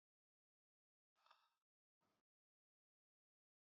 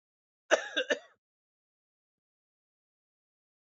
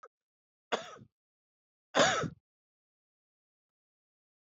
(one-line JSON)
{"exhalation_length": "3.8 s", "exhalation_amplitude": 48, "exhalation_signal_mean_std_ratio": 0.21, "cough_length": "3.7 s", "cough_amplitude": 11893, "cough_signal_mean_std_ratio": 0.19, "three_cough_length": "4.4 s", "three_cough_amplitude": 9271, "three_cough_signal_mean_std_ratio": 0.23, "survey_phase": "alpha (2021-03-01 to 2021-08-12)", "age": "18-44", "gender": "Male", "wearing_mask": "No", "symptom_cough_any": true, "symptom_diarrhoea": true, "symptom_fatigue": true, "symptom_fever_high_temperature": true, "symptom_headache": true, "symptom_change_to_sense_of_smell_or_taste": true, "symptom_onset": "4 days", "smoker_status": "Never smoked", "respiratory_condition_asthma": false, "respiratory_condition_other": false, "recruitment_source": "Test and Trace", "submission_delay": "1 day", "covid_test_result": "Positive", "covid_test_method": "RT-qPCR"}